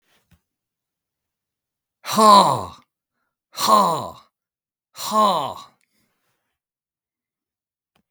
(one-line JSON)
{"exhalation_length": "8.1 s", "exhalation_amplitude": 32768, "exhalation_signal_mean_std_ratio": 0.31, "survey_phase": "beta (2021-08-13 to 2022-03-07)", "age": "65+", "gender": "Male", "wearing_mask": "No", "symptom_none": true, "smoker_status": "Never smoked", "respiratory_condition_asthma": false, "respiratory_condition_other": false, "recruitment_source": "REACT", "submission_delay": "3 days", "covid_test_result": "Negative", "covid_test_method": "RT-qPCR"}